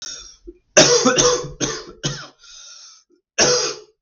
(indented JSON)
{
  "three_cough_length": "4.0 s",
  "three_cough_amplitude": 32768,
  "three_cough_signal_mean_std_ratio": 0.49,
  "survey_phase": "beta (2021-08-13 to 2022-03-07)",
  "age": "18-44",
  "gender": "Male",
  "wearing_mask": "No",
  "symptom_cough_any": true,
  "symptom_runny_or_blocked_nose": true,
  "symptom_sore_throat": true,
  "symptom_headache": true,
  "symptom_onset": "8 days",
  "smoker_status": "Never smoked",
  "respiratory_condition_asthma": false,
  "respiratory_condition_other": false,
  "recruitment_source": "Test and Trace",
  "submission_delay": "2 days",
  "covid_test_result": "Positive",
  "covid_test_method": "RT-qPCR",
  "covid_ct_value": 30.6,
  "covid_ct_gene": "N gene",
  "covid_ct_mean": 31.2,
  "covid_viral_load": "57 copies/ml",
  "covid_viral_load_category": "Minimal viral load (< 10K copies/ml)"
}